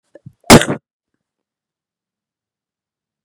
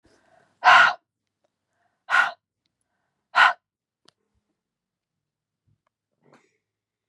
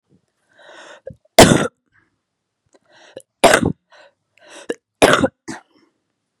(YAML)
cough_length: 3.2 s
cough_amplitude: 32768
cough_signal_mean_std_ratio: 0.18
exhalation_length: 7.1 s
exhalation_amplitude: 28028
exhalation_signal_mean_std_ratio: 0.23
three_cough_length: 6.4 s
three_cough_amplitude: 32768
three_cough_signal_mean_std_ratio: 0.26
survey_phase: beta (2021-08-13 to 2022-03-07)
age: 18-44
gender: Female
wearing_mask: 'No'
symptom_runny_or_blocked_nose: true
symptom_sore_throat: true
symptom_fatigue: true
symptom_headache: true
symptom_onset: 3 days
smoker_status: Never smoked
respiratory_condition_asthma: false
respiratory_condition_other: false
recruitment_source: Test and Trace
submission_delay: 2 days
covid_test_result: Positive
covid_test_method: RT-qPCR
covid_ct_value: 13.4
covid_ct_gene: ORF1ab gene
covid_ct_mean: 14.1
covid_viral_load: 23000000 copies/ml
covid_viral_load_category: High viral load (>1M copies/ml)